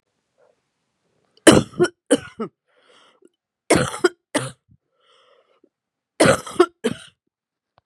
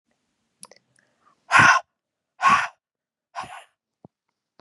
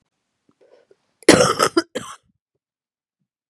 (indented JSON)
{
  "three_cough_length": "7.9 s",
  "three_cough_amplitude": 32768,
  "three_cough_signal_mean_std_ratio": 0.27,
  "exhalation_length": "4.6 s",
  "exhalation_amplitude": 25327,
  "exhalation_signal_mean_std_ratio": 0.28,
  "cough_length": "3.5 s",
  "cough_amplitude": 32768,
  "cough_signal_mean_std_ratio": 0.26,
  "survey_phase": "beta (2021-08-13 to 2022-03-07)",
  "age": "45-64",
  "gender": "Female",
  "wearing_mask": "No",
  "symptom_cough_any": true,
  "symptom_headache": true,
  "symptom_change_to_sense_of_smell_or_taste": true,
  "symptom_onset": "7 days",
  "smoker_status": "Ex-smoker",
  "respiratory_condition_asthma": false,
  "respiratory_condition_other": false,
  "recruitment_source": "Test and Trace",
  "submission_delay": "2 days",
  "covid_test_result": "Positive",
  "covid_test_method": "RT-qPCR"
}